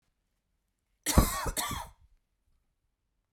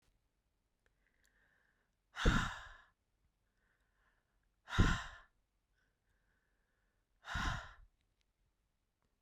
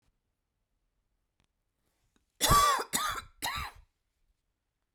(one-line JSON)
{"cough_length": "3.3 s", "cough_amplitude": 14898, "cough_signal_mean_std_ratio": 0.29, "exhalation_length": "9.2 s", "exhalation_amplitude": 4352, "exhalation_signal_mean_std_ratio": 0.24, "three_cough_length": "4.9 s", "three_cough_amplitude": 9491, "three_cough_signal_mean_std_ratio": 0.32, "survey_phase": "beta (2021-08-13 to 2022-03-07)", "age": "45-64", "gender": "Female", "wearing_mask": "No", "symptom_cough_any": true, "smoker_status": "Never smoked", "respiratory_condition_asthma": false, "respiratory_condition_other": false, "recruitment_source": "REACT", "submission_delay": "3 days", "covid_test_result": "Negative", "covid_test_method": "RT-qPCR", "influenza_a_test_result": "Negative", "influenza_b_test_result": "Negative"}